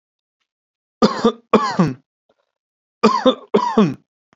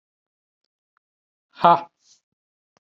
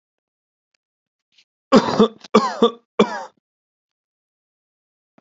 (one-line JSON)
{"cough_length": "4.4 s", "cough_amplitude": 31804, "cough_signal_mean_std_ratio": 0.4, "exhalation_length": "2.8 s", "exhalation_amplitude": 32533, "exhalation_signal_mean_std_ratio": 0.18, "three_cough_length": "5.2 s", "three_cough_amplitude": 29690, "three_cough_signal_mean_std_ratio": 0.27, "survey_phase": "alpha (2021-03-01 to 2021-08-12)", "age": "18-44", "gender": "Male", "wearing_mask": "No", "symptom_none": true, "smoker_status": "Never smoked", "respiratory_condition_asthma": false, "respiratory_condition_other": false, "recruitment_source": "REACT", "submission_delay": "3 days", "covid_test_result": "Negative", "covid_test_method": "RT-qPCR"}